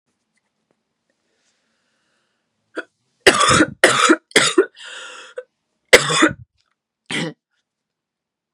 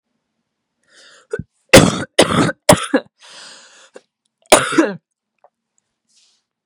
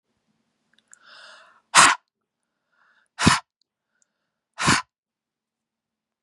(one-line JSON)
{"three_cough_length": "8.5 s", "three_cough_amplitude": 32768, "three_cough_signal_mean_std_ratio": 0.32, "cough_length": "6.7 s", "cough_amplitude": 32768, "cough_signal_mean_std_ratio": 0.3, "exhalation_length": "6.2 s", "exhalation_amplitude": 32767, "exhalation_signal_mean_std_ratio": 0.23, "survey_phase": "beta (2021-08-13 to 2022-03-07)", "age": "18-44", "gender": "Female", "wearing_mask": "No", "symptom_cough_any": true, "symptom_runny_or_blocked_nose": true, "symptom_headache": true, "smoker_status": "Never smoked", "respiratory_condition_asthma": false, "respiratory_condition_other": false, "recruitment_source": "Test and Trace", "submission_delay": "2 days", "covid_test_result": "Positive", "covid_test_method": "RT-qPCR", "covid_ct_value": 21.7, "covid_ct_gene": "N gene"}